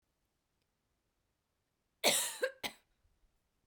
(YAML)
cough_length: 3.7 s
cough_amplitude: 6009
cough_signal_mean_std_ratio: 0.26
survey_phase: beta (2021-08-13 to 2022-03-07)
age: 45-64
gender: Female
wearing_mask: 'No'
symptom_none: true
smoker_status: Never smoked
respiratory_condition_asthma: false
respiratory_condition_other: false
recruitment_source: REACT
submission_delay: 1 day
covid_test_result: Negative
covid_test_method: RT-qPCR